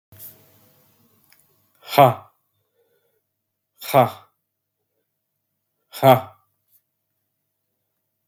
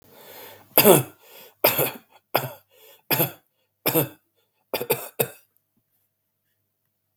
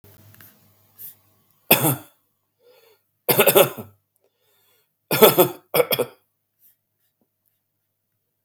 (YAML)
exhalation_length: 8.3 s
exhalation_amplitude: 32766
exhalation_signal_mean_std_ratio: 0.19
cough_length: 7.2 s
cough_amplitude: 32768
cough_signal_mean_std_ratio: 0.3
three_cough_length: 8.4 s
three_cough_amplitude: 32768
three_cough_signal_mean_std_ratio: 0.28
survey_phase: beta (2021-08-13 to 2022-03-07)
age: 45-64
gender: Male
wearing_mask: 'No'
symptom_runny_or_blocked_nose: true
symptom_fatigue: true
symptom_onset: 3 days
smoker_status: Never smoked
respiratory_condition_asthma: false
respiratory_condition_other: false
recruitment_source: Test and Trace
submission_delay: 1 day
covid_test_result: Positive
covid_test_method: RT-qPCR
covid_ct_value: 20.0
covid_ct_gene: N gene
covid_ct_mean: 20.2
covid_viral_load: 250000 copies/ml
covid_viral_load_category: Low viral load (10K-1M copies/ml)